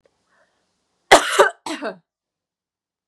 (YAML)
cough_length: 3.1 s
cough_amplitude: 32768
cough_signal_mean_std_ratio: 0.26
survey_phase: beta (2021-08-13 to 2022-03-07)
age: 18-44
gender: Female
wearing_mask: 'No'
symptom_cough_any: true
symptom_runny_or_blocked_nose: true
symptom_fatigue: true
symptom_headache: true
symptom_onset: 3 days
smoker_status: Never smoked
respiratory_condition_asthma: false
respiratory_condition_other: false
recruitment_source: Test and Trace
submission_delay: 2 days
covid_test_result: Positive
covid_test_method: ePCR